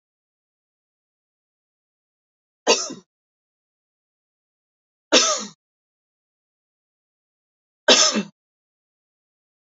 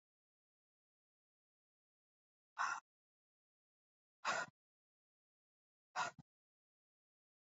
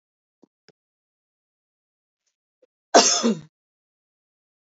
{"three_cough_length": "9.6 s", "three_cough_amplitude": 30843, "three_cough_signal_mean_std_ratio": 0.21, "exhalation_length": "7.4 s", "exhalation_amplitude": 1699, "exhalation_signal_mean_std_ratio": 0.21, "cough_length": "4.8 s", "cough_amplitude": 27982, "cough_signal_mean_std_ratio": 0.21, "survey_phase": "alpha (2021-03-01 to 2021-08-12)", "age": "18-44", "gender": "Female", "wearing_mask": "No", "symptom_cough_any": true, "symptom_onset": "3 days", "smoker_status": "Never smoked", "respiratory_condition_asthma": false, "respiratory_condition_other": false, "recruitment_source": "Test and Trace", "submission_delay": "1 day", "covid_test_result": "Positive", "covid_test_method": "RT-qPCR"}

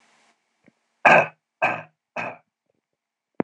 {"three_cough_length": "3.4 s", "three_cough_amplitude": 26028, "three_cough_signal_mean_std_ratio": 0.26, "survey_phase": "beta (2021-08-13 to 2022-03-07)", "age": "18-44", "gender": "Male", "wearing_mask": "No", "symptom_none": true, "symptom_onset": "6 days", "smoker_status": "Never smoked", "respiratory_condition_asthma": false, "respiratory_condition_other": false, "recruitment_source": "REACT", "submission_delay": "3 days", "covid_test_result": "Negative", "covid_test_method": "RT-qPCR", "influenza_a_test_result": "Negative", "influenza_b_test_result": "Negative"}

